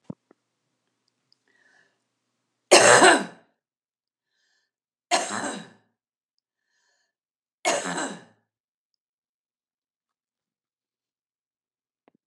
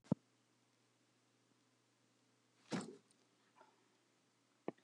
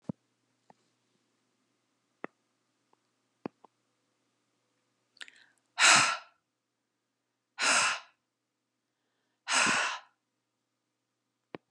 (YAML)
three_cough_length: 12.3 s
three_cough_amplitude: 31685
three_cough_signal_mean_std_ratio: 0.21
cough_length: 4.8 s
cough_amplitude: 2709
cough_signal_mean_std_ratio: 0.18
exhalation_length: 11.7 s
exhalation_amplitude: 12803
exhalation_signal_mean_std_ratio: 0.25
survey_phase: alpha (2021-03-01 to 2021-08-12)
age: 45-64
gender: Female
wearing_mask: 'No'
symptom_none: true
smoker_status: Ex-smoker
respiratory_condition_asthma: false
respiratory_condition_other: false
recruitment_source: REACT
submission_delay: 2 days
covid_test_result: Negative
covid_test_method: RT-qPCR